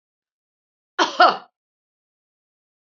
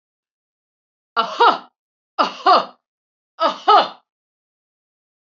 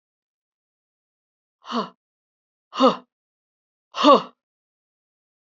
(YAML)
cough_length: 2.8 s
cough_amplitude: 26970
cough_signal_mean_std_ratio: 0.22
three_cough_length: 5.2 s
three_cough_amplitude: 28241
three_cough_signal_mean_std_ratio: 0.33
exhalation_length: 5.5 s
exhalation_amplitude: 28555
exhalation_signal_mean_std_ratio: 0.22
survey_phase: beta (2021-08-13 to 2022-03-07)
age: 45-64
gender: Female
wearing_mask: 'No'
symptom_none: true
smoker_status: Never smoked
respiratory_condition_asthma: false
respiratory_condition_other: false
recruitment_source: Test and Trace
submission_delay: 1 day
covid_test_result: Negative
covid_test_method: LFT